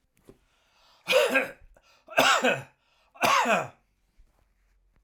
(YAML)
three_cough_length: 5.0 s
three_cough_amplitude: 18486
three_cough_signal_mean_std_ratio: 0.42
survey_phase: alpha (2021-03-01 to 2021-08-12)
age: 65+
gender: Male
wearing_mask: 'No'
symptom_none: true
smoker_status: Ex-smoker
respiratory_condition_asthma: false
respiratory_condition_other: false
recruitment_source: REACT
submission_delay: 5 days
covid_test_result: Negative
covid_test_method: RT-qPCR